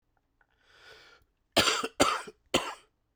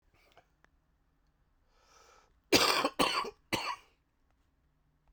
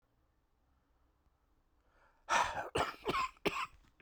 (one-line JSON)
{"three_cough_length": "3.2 s", "three_cough_amplitude": 15665, "three_cough_signal_mean_std_ratio": 0.35, "cough_length": "5.1 s", "cough_amplitude": 11053, "cough_signal_mean_std_ratio": 0.31, "exhalation_length": "4.0 s", "exhalation_amplitude": 4135, "exhalation_signal_mean_std_ratio": 0.39, "survey_phase": "beta (2021-08-13 to 2022-03-07)", "age": "18-44", "gender": "Male", "wearing_mask": "No", "symptom_cough_any": true, "symptom_runny_or_blocked_nose": true, "symptom_shortness_of_breath": true, "symptom_sore_throat": true, "symptom_fatigue": true, "symptom_fever_high_temperature": true, "symptom_headache": true, "symptom_change_to_sense_of_smell_or_taste": true, "symptom_loss_of_taste": true, "symptom_onset": "4 days", "smoker_status": "Never smoked", "respiratory_condition_asthma": false, "respiratory_condition_other": false, "recruitment_source": "Test and Trace", "submission_delay": "1 day", "covid_test_result": "Positive", "covid_test_method": "RT-qPCR", "covid_ct_value": 19.1, "covid_ct_gene": "ORF1ab gene", "covid_ct_mean": 21.1, "covid_viral_load": "120000 copies/ml", "covid_viral_load_category": "Low viral load (10K-1M copies/ml)"}